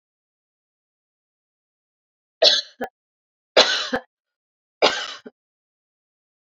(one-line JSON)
{"three_cough_length": "6.5 s", "three_cough_amplitude": 30220, "three_cough_signal_mean_std_ratio": 0.25, "survey_phase": "alpha (2021-03-01 to 2021-08-12)", "age": "45-64", "gender": "Female", "wearing_mask": "No", "symptom_none": true, "smoker_status": "Ex-smoker", "respiratory_condition_asthma": true, "respiratory_condition_other": false, "recruitment_source": "REACT", "submission_delay": "3 days", "covid_test_result": "Negative", "covid_test_method": "RT-qPCR"}